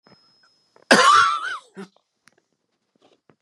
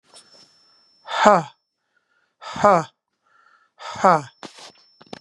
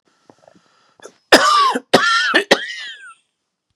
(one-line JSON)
{"cough_length": "3.4 s", "cough_amplitude": 31315, "cough_signal_mean_std_ratio": 0.33, "exhalation_length": "5.2 s", "exhalation_amplitude": 32767, "exhalation_signal_mean_std_ratio": 0.28, "three_cough_length": "3.8 s", "three_cough_amplitude": 32768, "three_cough_signal_mean_std_ratio": 0.44, "survey_phase": "beta (2021-08-13 to 2022-03-07)", "age": "45-64", "gender": "Male", "wearing_mask": "No", "symptom_cough_any": true, "symptom_runny_or_blocked_nose": true, "symptom_sore_throat": true, "symptom_onset": "12 days", "smoker_status": "Never smoked", "respiratory_condition_asthma": false, "respiratory_condition_other": false, "recruitment_source": "REACT", "submission_delay": "1 day", "covid_test_result": "Negative", "covid_test_method": "RT-qPCR", "influenza_a_test_result": "Negative", "influenza_b_test_result": "Negative"}